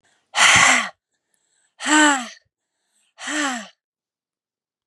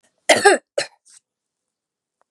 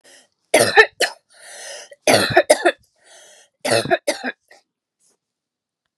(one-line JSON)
{"exhalation_length": "4.9 s", "exhalation_amplitude": 29870, "exhalation_signal_mean_std_ratio": 0.39, "cough_length": "2.3 s", "cough_amplitude": 32768, "cough_signal_mean_std_ratio": 0.27, "three_cough_length": "6.0 s", "three_cough_amplitude": 32768, "three_cough_signal_mean_std_ratio": 0.35, "survey_phase": "beta (2021-08-13 to 2022-03-07)", "age": "45-64", "gender": "Female", "wearing_mask": "No", "symptom_runny_or_blocked_nose": true, "smoker_status": "Never smoked", "respiratory_condition_asthma": false, "respiratory_condition_other": false, "recruitment_source": "Test and Trace", "submission_delay": "2 days", "covid_test_result": "Positive", "covid_test_method": "RT-qPCR", "covid_ct_value": 24.8, "covid_ct_gene": "N gene"}